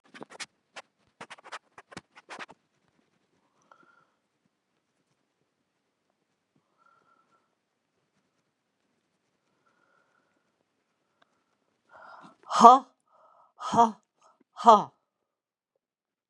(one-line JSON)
{"exhalation_length": "16.3 s", "exhalation_amplitude": 31204, "exhalation_signal_mean_std_ratio": 0.15, "survey_phase": "beta (2021-08-13 to 2022-03-07)", "age": "65+", "gender": "Male", "wearing_mask": "No", "symptom_cough_any": true, "symptom_runny_or_blocked_nose": true, "symptom_sore_throat": true, "smoker_status": "Never smoked", "respiratory_condition_asthma": false, "respiratory_condition_other": false, "recruitment_source": "Test and Trace", "submission_delay": "3 days", "covid_test_result": "Positive", "covid_test_method": "LFT"}